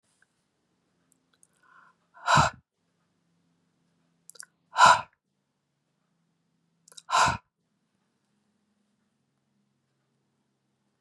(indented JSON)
{
  "exhalation_length": "11.0 s",
  "exhalation_amplitude": 19428,
  "exhalation_signal_mean_std_ratio": 0.19,
  "survey_phase": "beta (2021-08-13 to 2022-03-07)",
  "age": "45-64",
  "gender": "Female",
  "wearing_mask": "No",
  "symptom_none": true,
  "smoker_status": "Never smoked",
  "respiratory_condition_asthma": false,
  "respiratory_condition_other": true,
  "recruitment_source": "REACT",
  "submission_delay": "2 days",
  "covid_test_result": "Negative",
  "covid_test_method": "RT-qPCR",
  "influenza_a_test_result": "Negative",
  "influenza_b_test_result": "Negative"
}